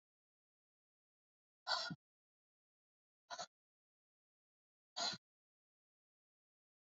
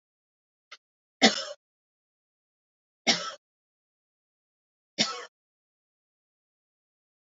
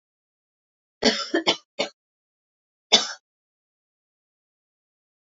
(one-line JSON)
{"exhalation_length": "6.9 s", "exhalation_amplitude": 1615, "exhalation_signal_mean_std_ratio": 0.22, "three_cough_length": "7.3 s", "three_cough_amplitude": 22288, "three_cough_signal_mean_std_ratio": 0.18, "cough_length": "5.4 s", "cough_amplitude": 29547, "cough_signal_mean_std_ratio": 0.23, "survey_phase": "beta (2021-08-13 to 2022-03-07)", "age": "18-44", "gender": "Female", "wearing_mask": "No", "symptom_runny_or_blocked_nose": true, "symptom_shortness_of_breath": true, "symptom_sore_throat": true, "symptom_abdominal_pain": true, "symptom_fatigue": true, "symptom_headache": true, "symptom_change_to_sense_of_smell_or_taste": true, "symptom_loss_of_taste": true, "smoker_status": "Ex-smoker", "respiratory_condition_asthma": false, "respiratory_condition_other": false, "recruitment_source": "Test and Trace", "submission_delay": "1 day", "covid_test_result": "Positive", "covid_test_method": "RT-qPCR", "covid_ct_value": 15.0, "covid_ct_gene": "ORF1ab gene", "covid_ct_mean": 15.2, "covid_viral_load": "10000000 copies/ml", "covid_viral_load_category": "High viral load (>1M copies/ml)"}